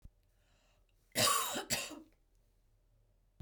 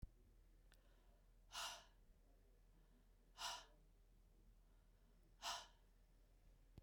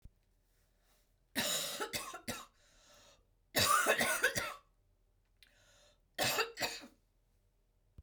{"cough_length": "3.4 s", "cough_amplitude": 4480, "cough_signal_mean_std_ratio": 0.36, "exhalation_length": "6.8 s", "exhalation_amplitude": 476, "exhalation_signal_mean_std_ratio": 0.51, "three_cough_length": "8.0 s", "three_cough_amplitude": 4927, "three_cough_signal_mean_std_ratio": 0.42, "survey_phase": "beta (2021-08-13 to 2022-03-07)", "age": "45-64", "gender": "Female", "wearing_mask": "No", "symptom_cough_any": true, "symptom_runny_or_blocked_nose": true, "symptom_sore_throat": true, "symptom_headache": true, "symptom_change_to_sense_of_smell_or_taste": true, "symptom_onset": "3 days", "smoker_status": "Ex-smoker", "respiratory_condition_asthma": false, "respiratory_condition_other": false, "recruitment_source": "Test and Trace", "submission_delay": "1 day", "covid_test_result": "Positive", "covid_test_method": "RT-qPCR", "covid_ct_value": 19.1, "covid_ct_gene": "ORF1ab gene", "covid_ct_mean": 20.2, "covid_viral_load": "240000 copies/ml", "covid_viral_load_category": "Low viral load (10K-1M copies/ml)"}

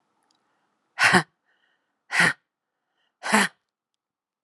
{"exhalation_length": "4.4 s", "exhalation_amplitude": 28821, "exhalation_signal_mean_std_ratio": 0.29, "survey_phase": "beta (2021-08-13 to 2022-03-07)", "age": "45-64", "gender": "Female", "wearing_mask": "No", "symptom_cough_any": true, "symptom_sore_throat": true, "symptom_fatigue": true, "symptom_headache": true, "smoker_status": "Never smoked", "respiratory_condition_asthma": false, "respiratory_condition_other": false, "recruitment_source": "Test and Trace", "submission_delay": "2 days", "covid_test_result": "Positive", "covid_test_method": "ePCR"}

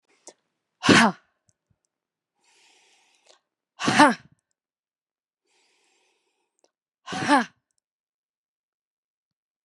{"exhalation_length": "9.6 s", "exhalation_amplitude": 31495, "exhalation_signal_mean_std_ratio": 0.21, "survey_phase": "beta (2021-08-13 to 2022-03-07)", "age": "45-64", "gender": "Male", "wearing_mask": "No", "symptom_cough_any": true, "symptom_new_continuous_cough": true, "symptom_sore_throat": true, "symptom_fatigue": true, "symptom_change_to_sense_of_smell_or_taste": true, "smoker_status": "Ex-smoker", "respiratory_condition_asthma": true, "respiratory_condition_other": false, "recruitment_source": "Test and Trace", "submission_delay": "2 days", "covid_test_result": "Positive", "covid_test_method": "RT-qPCR"}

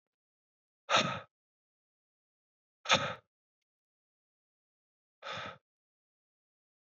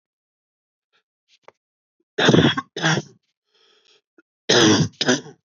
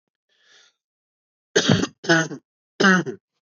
{"exhalation_length": "6.9 s", "exhalation_amplitude": 8697, "exhalation_signal_mean_std_ratio": 0.22, "cough_length": "5.5 s", "cough_amplitude": 26434, "cough_signal_mean_std_ratio": 0.37, "three_cough_length": "3.5 s", "three_cough_amplitude": 26441, "three_cough_signal_mean_std_ratio": 0.37, "survey_phase": "beta (2021-08-13 to 2022-03-07)", "age": "18-44", "gender": "Male", "wearing_mask": "No", "symptom_new_continuous_cough": true, "symptom_runny_or_blocked_nose": true, "symptom_fatigue": true, "symptom_fever_high_temperature": true, "symptom_headache": true, "symptom_onset": "3 days", "smoker_status": "Never smoked", "respiratory_condition_asthma": true, "respiratory_condition_other": false, "recruitment_source": "Test and Trace", "submission_delay": "1 day", "covid_test_result": "Positive", "covid_test_method": "ePCR"}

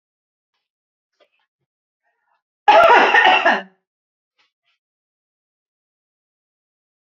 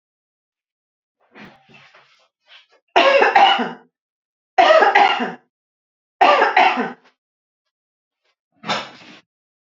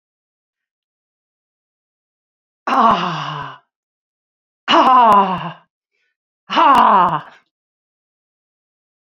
{"cough_length": "7.1 s", "cough_amplitude": 30820, "cough_signal_mean_std_ratio": 0.29, "three_cough_length": "9.6 s", "three_cough_amplitude": 28631, "three_cough_signal_mean_std_ratio": 0.38, "exhalation_length": "9.1 s", "exhalation_amplitude": 28385, "exhalation_signal_mean_std_ratio": 0.38, "survey_phase": "beta (2021-08-13 to 2022-03-07)", "age": "65+", "gender": "Female", "wearing_mask": "No", "symptom_none": true, "smoker_status": "Never smoked", "respiratory_condition_asthma": false, "respiratory_condition_other": false, "recruitment_source": "REACT", "submission_delay": "1 day", "covid_test_result": "Negative", "covid_test_method": "RT-qPCR", "influenza_a_test_result": "Unknown/Void", "influenza_b_test_result": "Unknown/Void"}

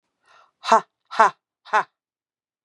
{"exhalation_length": "2.6 s", "exhalation_amplitude": 29658, "exhalation_signal_mean_std_ratio": 0.26, "survey_phase": "beta (2021-08-13 to 2022-03-07)", "age": "45-64", "gender": "Female", "wearing_mask": "No", "symptom_cough_any": true, "symptom_runny_or_blocked_nose": true, "symptom_sore_throat": true, "symptom_fatigue": true, "symptom_headache": true, "symptom_change_to_sense_of_smell_or_taste": true, "symptom_loss_of_taste": true, "smoker_status": "Never smoked", "respiratory_condition_asthma": false, "respiratory_condition_other": false, "recruitment_source": "Test and Trace", "submission_delay": "2 days", "covid_test_result": "Positive", "covid_test_method": "RT-qPCR", "covid_ct_value": 23.6, "covid_ct_gene": "ORF1ab gene"}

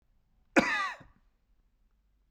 {"cough_length": "2.3 s", "cough_amplitude": 11584, "cough_signal_mean_std_ratio": 0.28, "survey_phase": "beta (2021-08-13 to 2022-03-07)", "age": "18-44", "gender": "Male", "wearing_mask": "No", "symptom_runny_or_blocked_nose": true, "symptom_fatigue": true, "symptom_headache": true, "smoker_status": "Never smoked", "respiratory_condition_asthma": false, "respiratory_condition_other": false, "recruitment_source": "Test and Trace", "submission_delay": "0 days", "covid_test_result": "Negative", "covid_test_method": "LFT"}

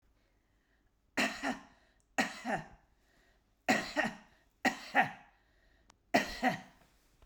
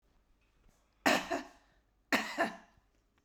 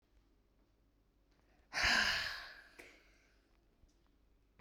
{"three_cough_length": "7.3 s", "three_cough_amplitude": 6877, "three_cough_signal_mean_std_ratio": 0.37, "cough_length": "3.2 s", "cough_amplitude": 7572, "cough_signal_mean_std_ratio": 0.34, "exhalation_length": "4.6 s", "exhalation_amplitude": 3045, "exhalation_signal_mean_std_ratio": 0.33, "survey_phase": "beta (2021-08-13 to 2022-03-07)", "age": "45-64", "gender": "Female", "wearing_mask": "No", "symptom_none": true, "smoker_status": "Never smoked", "respiratory_condition_asthma": false, "respiratory_condition_other": false, "recruitment_source": "REACT", "submission_delay": "1 day", "covid_test_result": "Negative", "covid_test_method": "RT-qPCR", "influenza_a_test_result": "Negative", "influenza_b_test_result": "Negative"}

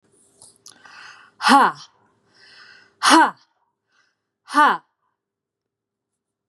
{"exhalation_length": "6.5 s", "exhalation_amplitude": 30474, "exhalation_signal_mean_std_ratio": 0.28, "survey_phase": "beta (2021-08-13 to 2022-03-07)", "age": "18-44", "gender": "Female", "wearing_mask": "No", "symptom_none": true, "smoker_status": "Never smoked", "respiratory_condition_asthma": false, "respiratory_condition_other": false, "recruitment_source": "REACT", "submission_delay": "1 day", "covid_test_result": "Negative", "covid_test_method": "RT-qPCR", "influenza_a_test_result": "Negative", "influenza_b_test_result": "Negative"}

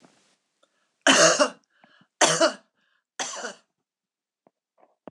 {"three_cough_length": "5.1 s", "three_cough_amplitude": 22847, "three_cough_signal_mean_std_ratio": 0.31, "survey_phase": "beta (2021-08-13 to 2022-03-07)", "age": "45-64", "gender": "Female", "wearing_mask": "No", "symptom_none": true, "smoker_status": "Never smoked", "respiratory_condition_asthma": false, "respiratory_condition_other": false, "recruitment_source": "REACT", "submission_delay": "1 day", "covid_test_method": "RT-qPCR"}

